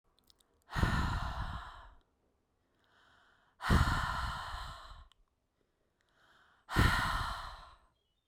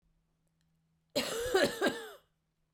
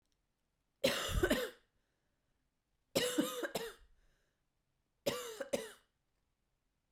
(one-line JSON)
{"exhalation_length": "8.3 s", "exhalation_amplitude": 6362, "exhalation_signal_mean_std_ratio": 0.44, "cough_length": "2.7 s", "cough_amplitude": 5093, "cough_signal_mean_std_ratio": 0.42, "three_cough_length": "6.9 s", "three_cough_amplitude": 3944, "three_cough_signal_mean_std_ratio": 0.38, "survey_phase": "beta (2021-08-13 to 2022-03-07)", "age": "18-44", "gender": "Female", "wearing_mask": "No", "symptom_cough_any": true, "symptom_new_continuous_cough": true, "symptom_runny_or_blocked_nose": true, "symptom_shortness_of_breath": true, "symptom_sore_throat": true, "symptom_fatigue": true, "symptom_fever_high_temperature": true, "symptom_headache": true, "symptom_other": true, "symptom_onset": "2 days", "smoker_status": "Never smoked", "respiratory_condition_asthma": false, "respiratory_condition_other": false, "recruitment_source": "Test and Trace", "submission_delay": "1 day", "covid_test_result": "Positive", "covid_test_method": "RT-qPCR", "covid_ct_value": 24.3, "covid_ct_gene": "N gene"}